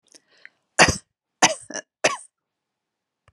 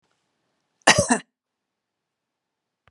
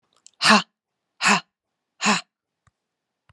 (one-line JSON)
{"three_cough_length": "3.3 s", "three_cough_amplitude": 30986, "three_cough_signal_mean_std_ratio": 0.24, "cough_length": "2.9 s", "cough_amplitude": 32746, "cough_signal_mean_std_ratio": 0.21, "exhalation_length": "3.3 s", "exhalation_amplitude": 29157, "exhalation_signal_mean_std_ratio": 0.31, "survey_phase": "beta (2021-08-13 to 2022-03-07)", "age": "45-64", "gender": "Female", "wearing_mask": "No", "symptom_none": true, "smoker_status": "Never smoked", "respiratory_condition_asthma": false, "respiratory_condition_other": false, "recruitment_source": "REACT", "submission_delay": "0 days", "covid_test_result": "Negative", "covid_test_method": "RT-qPCR"}